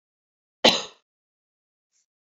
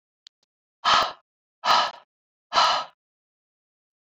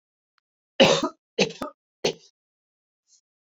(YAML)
cough_length: 2.3 s
cough_amplitude: 29215
cough_signal_mean_std_ratio: 0.18
exhalation_length: 4.1 s
exhalation_amplitude: 16128
exhalation_signal_mean_std_ratio: 0.35
three_cough_length: 3.4 s
three_cough_amplitude: 27638
three_cough_signal_mean_std_ratio: 0.28
survey_phase: beta (2021-08-13 to 2022-03-07)
age: 45-64
gender: Female
wearing_mask: 'No'
symptom_none: true
smoker_status: Ex-smoker
respiratory_condition_asthma: false
respiratory_condition_other: false
recruitment_source: REACT
submission_delay: 4 days
covid_test_result: Negative
covid_test_method: RT-qPCR